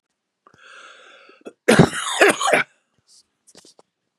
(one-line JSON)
{"cough_length": "4.2 s", "cough_amplitude": 32768, "cough_signal_mean_std_ratio": 0.32, "survey_phase": "beta (2021-08-13 to 2022-03-07)", "age": "65+", "gender": "Male", "wearing_mask": "No", "symptom_none": true, "smoker_status": "Never smoked", "respiratory_condition_asthma": false, "respiratory_condition_other": false, "recruitment_source": "REACT", "submission_delay": "1 day", "covid_test_result": "Negative", "covid_test_method": "RT-qPCR", "influenza_a_test_result": "Negative", "influenza_b_test_result": "Negative"}